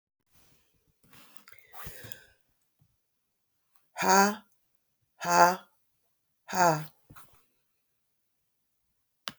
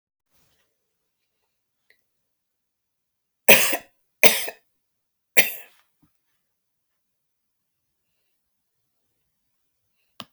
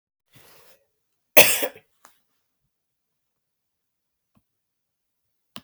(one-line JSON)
{"exhalation_length": "9.4 s", "exhalation_amplitude": 16217, "exhalation_signal_mean_std_ratio": 0.25, "three_cough_length": "10.3 s", "three_cough_amplitude": 32768, "three_cough_signal_mean_std_ratio": 0.16, "cough_length": "5.6 s", "cough_amplitude": 32768, "cough_signal_mean_std_ratio": 0.15, "survey_phase": "beta (2021-08-13 to 2022-03-07)", "age": "65+", "gender": "Female", "wearing_mask": "No", "symptom_none": true, "symptom_onset": "7 days", "smoker_status": "Never smoked", "respiratory_condition_asthma": false, "respiratory_condition_other": false, "recruitment_source": "REACT", "submission_delay": "2 days", "covid_test_result": "Negative", "covid_test_method": "RT-qPCR", "influenza_a_test_result": "Negative", "influenza_b_test_result": "Negative"}